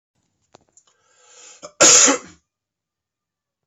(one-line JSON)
{"cough_length": "3.7 s", "cough_amplitude": 32767, "cough_signal_mean_std_ratio": 0.26, "survey_phase": "beta (2021-08-13 to 2022-03-07)", "age": "18-44", "gender": "Female", "wearing_mask": "No", "symptom_cough_any": true, "symptom_runny_or_blocked_nose": true, "symptom_fatigue": true, "symptom_headache": true, "symptom_change_to_sense_of_smell_or_taste": true, "symptom_loss_of_taste": true, "symptom_onset": "4 days", "smoker_status": "Ex-smoker", "respiratory_condition_asthma": false, "respiratory_condition_other": false, "recruitment_source": "Test and Trace", "submission_delay": "3 days", "covid_test_result": "Positive", "covid_test_method": "RT-qPCR"}